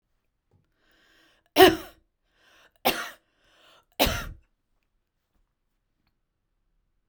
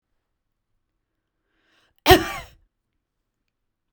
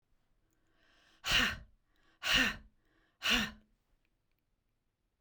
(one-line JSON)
{"three_cough_length": "7.1 s", "three_cough_amplitude": 31140, "three_cough_signal_mean_std_ratio": 0.19, "cough_length": "3.9 s", "cough_amplitude": 32768, "cough_signal_mean_std_ratio": 0.16, "exhalation_length": "5.2 s", "exhalation_amplitude": 6047, "exhalation_signal_mean_std_ratio": 0.33, "survey_phase": "beta (2021-08-13 to 2022-03-07)", "age": "45-64", "gender": "Female", "wearing_mask": "No", "symptom_sore_throat": true, "symptom_fatigue": true, "symptom_headache": true, "symptom_change_to_sense_of_smell_or_taste": true, "symptom_onset": "3 days", "smoker_status": "Never smoked", "respiratory_condition_asthma": false, "respiratory_condition_other": false, "recruitment_source": "Test and Trace", "submission_delay": "1 day", "covid_test_result": "Positive", "covid_test_method": "RT-qPCR"}